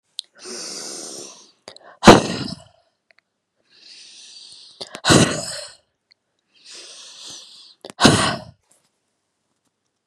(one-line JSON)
{"exhalation_length": "10.1 s", "exhalation_amplitude": 32768, "exhalation_signal_mean_std_ratio": 0.26, "survey_phase": "beta (2021-08-13 to 2022-03-07)", "age": "65+", "gender": "Female", "wearing_mask": "No", "symptom_none": true, "smoker_status": "Never smoked", "respiratory_condition_asthma": false, "respiratory_condition_other": false, "recruitment_source": "REACT", "submission_delay": "3 days", "covid_test_result": "Negative", "covid_test_method": "RT-qPCR", "influenza_a_test_result": "Negative", "influenza_b_test_result": "Negative"}